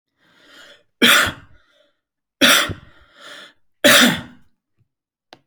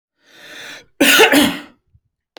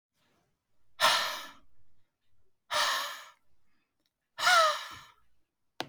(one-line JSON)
{"three_cough_length": "5.5 s", "three_cough_amplitude": 32767, "three_cough_signal_mean_std_ratio": 0.34, "cough_length": "2.4 s", "cough_amplitude": 32768, "cough_signal_mean_std_ratio": 0.42, "exhalation_length": "5.9 s", "exhalation_amplitude": 10405, "exhalation_signal_mean_std_ratio": 0.38, "survey_phase": "alpha (2021-03-01 to 2021-08-12)", "age": "18-44", "gender": "Male", "wearing_mask": "No", "symptom_none": true, "smoker_status": "Never smoked", "respiratory_condition_asthma": false, "respiratory_condition_other": false, "recruitment_source": "REACT", "submission_delay": "1 day", "covid_test_result": "Negative", "covid_test_method": "RT-qPCR"}